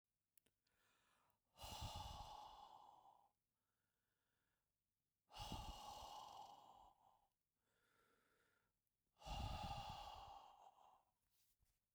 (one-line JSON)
{"exhalation_length": "11.9 s", "exhalation_amplitude": 451, "exhalation_signal_mean_std_ratio": 0.49, "survey_phase": "beta (2021-08-13 to 2022-03-07)", "age": "65+", "gender": "Male", "wearing_mask": "No", "symptom_none": true, "smoker_status": "Never smoked", "respiratory_condition_asthma": false, "respiratory_condition_other": false, "recruitment_source": "REACT", "submission_delay": "2 days", "covid_test_result": "Negative", "covid_test_method": "RT-qPCR"}